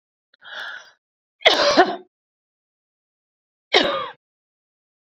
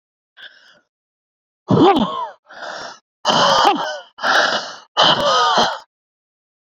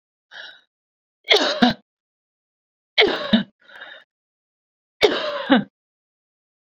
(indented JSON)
{
  "cough_length": "5.1 s",
  "cough_amplitude": 32768,
  "cough_signal_mean_std_ratio": 0.3,
  "exhalation_length": "6.7 s",
  "exhalation_amplitude": 28013,
  "exhalation_signal_mean_std_ratio": 0.53,
  "three_cough_length": "6.7 s",
  "three_cough_amplitude": 32768,
  "three_cough_signal_mean_std_ratio": 0.33,
  "survey_phase": "beta (2021-08-13 to 2022-03-07)",
  "age": "45-64",
  "gender": "Female",
  "wearing_mask": "No",
  "symptom_none": true,
  "smoker_status": "Never smoked",
  "respiratory_condition_asthma": false,
  "respiratory_condition_other": false,
  "recruitment_source": "REACT",
  "submission_delay": "2 days",
  "covid_test_result": "Negative",
  "covid_test_method": "RT-qPCR"
}